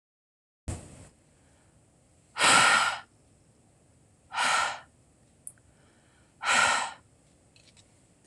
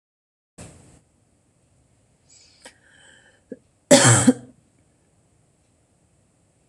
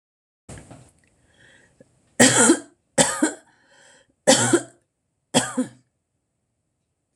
{"exhalation_length": "8.3 s", "exhalation_amplitude": 14954, "exhalation_signal_mean_std_ratio": 0.35, "cough_length": "6.7 s", "cough_amplitude": 26028, "cough_signal_mean_std_ratio": 0.21, "three_cough_length": "7.2 s", "three_cough_amplitude": 26027, "three_cough_signal_mean_std_ratio": 0.32, "survey_phase": "beta (2021-08-13 to 2022-03-07)", "age": "45-64", "gender": "Female", "wearing_mask": "No", "symptom_none": true, "smoker_status": "Ex-smoker", "respiratory_condition_asthma": false, "respiratory_condition_other": false, "recruitment_source": "REACT", "submission_delay": "1 day", "covid_test_result": "Negative", "covid_test_method": "RT-qPCR", "influenza_a_test_result": "Negative", "influenza_b_test_result": "Negative"}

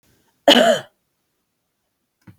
{"three_cough_length": "2.4 s", "three_cough_amplitude": 31309, "three_cough_signal_mean_std_ratio": 0.29, "survey_phase": "beta (2021-08-13 to 2022-03-07)", "age": "45-64", "gender": "Female", "wearing_mask": "No", "symptom_none": true, "smoker_status": "Never smoked", "respiratory_condition_asthma": false, "respiratory_condition_other": false, "recruitment_source": "REACT", "submission_delay": "2 days", "covid_test_result": "Negative", "covid_test_method": "RT-qPCR"}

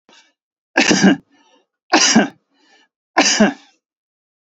{"three_cough_length": "4.4 s", "three_cough_amplitude": 32768, "three_cough_signal_mean_std_ratio": 0.4, "survey_phase": "beta (2021-08-13 to 2022-03-07)", "age": "45-64", "gender": "Male", "wearing_mask": "No", "symptom_none": true, "smoker_status": "Never smoked", "respiratory_condition_asthma": false, "respiratory_condition_other": false, "recruitment_source": "REACT", "submission_delay": "22 days", "covid_test_result": "Negative", "covid_test_method": "RT-qPCR", "influenza_a_test_result": "Negative", "influenza_b_test_result": "Negative"}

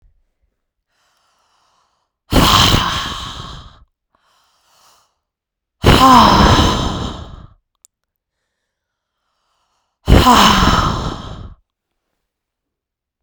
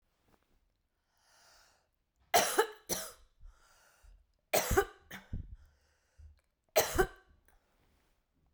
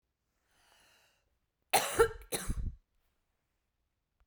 {"exhalation_length": "13.2 s", "exhalation_amplitude": 32768, "exhalation_signal_mean_std_ratio": 0.39, "three_cough_length": "8.5 s", "three_cough_amplitude": 7614, "three_cough_signal_mean_std_ratio": 0.28, "cough_length": "4.3 s", "cough_amplitude": 7896, "cough_signal_mean_std_ratio": 0.28, "survey_phase": "beta (2021-08-13 to 2022-03-07)", "age": "45-64", "gender": "Female", "wearing_mask": "No", "symptom_none": true, "smoker_status": "Ex-smoker", "respiratory_condition_asthma": false, "respiratory_condition_other": false, "recruitment_source": "REACT", "submission_delay": "2 days", "covid_test_result": "Negative", "covid_test_method": "RT-qPCR"}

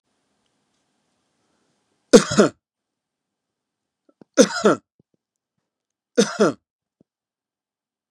{"three_cough_length": "8.1 s", "three_cough_amplitude": 32768, "three_cough_signal_mean_std_ratio": 0.21, "survey_phase": "beta (2021-08-13 to 2022-03-07)", "age": "65+", "gender": "Male", "wearing_mask": "No", "symptom_none": true, "smoker_status": "Never smoked", "respiratory_condition_asthma": false, "respiratory_condition_other": false, "recruitment_source": "REACT", "submission_delay": "2 days", "covid_test_result": "Negative", "covid_test_method": "RT-qPCR", "influenza_a_test_result": "Negative", "influenza_b_test_result": "Negative"}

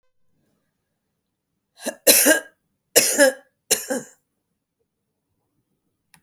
{"three_cough_length": "6.2 s", "three_cough_amplitude": 32768, "three_cough_signal_mean_std_ratio": 0.28, "survey_phase": "beta (2021-08-13 to 2022-03-07)", "age": "45-64", "gender": "Female", "wearing_mask": "No", "symptom_none": true, "smoker_status": "Never smoked", "respiratory_condition_asthma": false, "respiratory_condition_other": false, "recruitment_source": "REACT", "submission_delay": "1 day", "covid_test_result": "Negative", "covid_test_method": "RT-qPCR"}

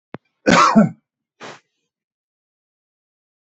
{"cough_length": "3.4 s", "cough_amplitude": 28831, "cough_signal_mean_std_ratio": 0.28, "survey_phase": "beta (2021-08-13 to 2022-03-07)", "age": "65+", "gender": "Male", "wearing_mask": "No", "symptom_none": true, "smoker_status": "Ex-smoker", "respiratory_condition_asthma": false, "respiratory_condition_other": false, "recruitment_source": "REACT", "submission_delay": "3 days", "covid_test_result": "Negative", "covid_test_method": "RT-qPCR", "influenza_a_test_result": "Negative", "influenza_b_test_result": "Negative"}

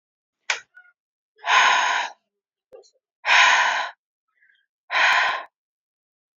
{"exhalation_length": "6.4 s", "exhalation_amplitude": 23683, "exhalation_signal_mean_std_ratio": 0.43, "survey_phase": "alpha (2021-03-01 to 2021-08-12)", "age": "18-44", "gender": "Female", "wearing_mask": "No", "symptom_abdominal_pain": true, "symptom_fatigue": true, "smoker_status": "Never smoked", "respiratory_condition_asthma": false, "respiratory_condition_other": false, "recruitment_source": "REACT", "submission_delay": "2 days", "covid_test_result": "Negative", "covid_test_method": "RT-qPCR"}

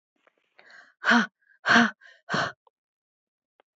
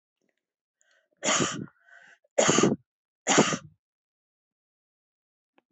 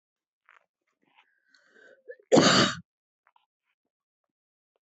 {"exhalation_length": "3.8 s", "exhalation_amplitude": 16952, "exhalation_signal_mean_std_ratio": 0.32, "three_cough_length": "5.7 s", "three_cough_amplitude": 14996, "three_cough_signal_mean_std_ratio": 0.32, "cough_length": "4.9 s", "cough_amplitude": 14639, "cough_signal_mean_std_ratio": 0.23, "survey_phase": "beta (2021-08-13 to 2022-03-07)", "age": "45-64", "gender": "Female", "wearing_mask": "No", "symptom_cough_any": true, "smoker_status": "Ex-smoker", "respiratory_condition_asthma": false, "respiratory_condition_other": false, "recruitment_source": "REACT", "submission_delay": "0 days", "covid_test_result": "Negative", "covid_test_method": "RT-qPCR", "influenza_a_test_result": "Negative", "influenza_b_test_result": "Negative"}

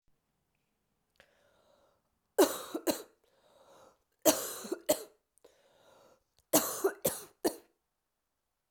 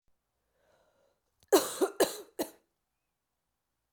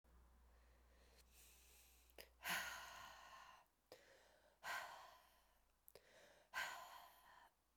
{"three_cough_length": "8.7 s", "three_cough_amplitude": 10041, "three_cough_signal_mean_std_ratio": 0.27, "cough_length": "3.9 s", "cough_amplitude": 10268, "cough_signal_mean_std_ratio": 0.25, "exhalation_length": "7.8 s", "exhalation_amplitude": 898, "exhalation_signal_mean_std_ratio": 0.48, "survey_phase": "beta (2021-08-13 to 2022-03-07)", "age": "18-44", "gender": "Female", "wearing_mask": "No", "symptom_cough_any": true, "symptom_runny_or_blocked_nose": true, "symptom_sore_throat": true, "symptom_fatigue": true, "symptom_headache": true, "symptom_onset": "4 days", "smoker_status": "Never smoked", "respiratory_condition_asthma": false, "respiratory_condition_other": false, "recruitment_source": "Test and Trace", "submission_delay": "2 days", "covid_test_result": "Positive", "covid_test_method": "RT-qPCR", "covid_ct_value": 16.0, "covid_ct_gene": "ORF1ab gene", "covid_ct_mean": 16.5, "covid_viral_load": "4000000 copies/ml", "covid_viral_load_category": "High viral load (>1M copies/ml)"}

